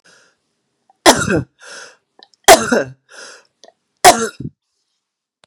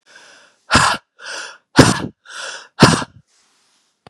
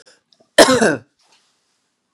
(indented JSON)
{
  "three_cough_length": "5.5 s",
  "three_cough_amplitude": 32768,
  "three_cough_signal_mean_std_ratio": 0.29,
  "exhalation_length": "4.1 s",
  "exhalation_amplitude": 32768,
  "exhalation_signal_mean_std_ratio": 0.34,
  "cough_length": "2.1 s",
  "cough_amplitude": 32768,
  "cough_signal_mean_std_ratio": 0.31,
  "survey_phase": "beta (2021-08-13 to 2022-03-07)",
  "age": "45-64",
  "gender": "Female",
  "wearing_mask": "No",
  "symptom_none": true,
  "smoker_status": "Ex-smoker",
  "respiratory_condition_asthma": true,
  "respiratory_condition_other": false,
  "recruitment_source": "REACT",
  "submission_delay": "2 days",
  "covid_test_result": "Negative",
  "covid_test_method": "RT-qPCR",
  "influenza_a_test_result": "Negative",
  "influenza_b_test_result": "Negative"
}